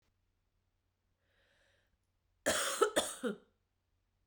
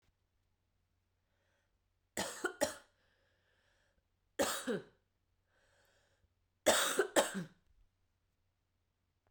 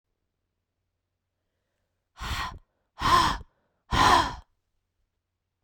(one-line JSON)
{"cough_length": "4.3 s", "cough_amplitude": 5886, "cough_signal_mean_std_ratio": 0.31, "three_cough_length": "9.3 s", "three_cough_amplitude": 5974, "three_cough_signal_mean_std_ratio": 0.28, "exhalation_length": "5.6 s", "exhalation_amplitude": 14678, "exhalation_signal_mean_std_ratio": 0.32, "survey_phase": "beta (2021-08-13 to 2022-03-07)", "age": "18-44", "gender": "Female", "wearing_mask": "No", "symptom_cough_any": true, "symptom_runny_or_blocked_nose": true, "symptom_sore_throat": true, "symptom_fatigue": true, "symptom_headache": true, "symptom_other": true, "symptom_onset": "2 days", "smoker_status": "Never smoked", "respiratory_condition_asthma": false, "respiratory_condition_other": false, "recruitment_source": "Test and Trace", "submission_delay": "2 days", "covid_test_result": "Positive", "covid_test_method": "RT-qPCR", "covid_ct_value": 14.9, "covid_ct_gene": "N gene"}